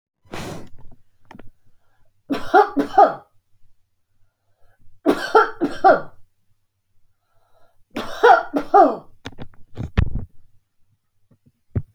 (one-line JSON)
{"three_cough_length": "11.9 s", "three_cough_amplitude": 29108, "three_cough_signal_mean_std_ratio": 0.36, "survey_phase": "alpha (2021-03-01 to 2021-08-12)", "age": "45-64", "gender": "Female", "wearing_mask": "No", "symptom_none": true, "smoker_status": "Ex-smoker", "respiratory_condition_asthma": false, "respiratory_condition_other": false, "recruitment_source": "REACT", "submission_delay": "1 day", "covid_test_result": "Negative", "covid_test_method": "RT-qPCR"}